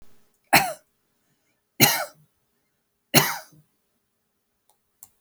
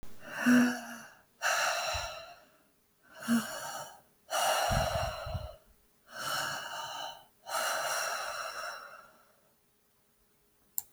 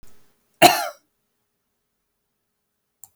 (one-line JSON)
{"three_cough_length": "5.2 s", "three_cough_amplitude": 32768, "three_cough_signal_mean_std_ratio": 0.25, "exhalation_length": "10.9 s", "exhalation_amplitude": 11458, "exhalation_signal_mean_std_ratio": 0.57, "cough_length": "3.2 s", "cough_amplitude": 30279, "cough_signal_mean_std_ratio": 0.19, "survey_phase": "beta (2021-08-13 to 2022-03-07)", "age": "45-64", "gender": "Female", "wearing_mask": "No", "symptom_none": true, "smoker_status": "Current smoker (e-cigarettes or vapes only)", "respiratory_condition_asthma": false, "respiratory_condition_other": false, "recruitment_source": "REACT", "submission_delay": "8 days", "covid_test_result": "Negative", "covid_test_method": "RT-qPCR"}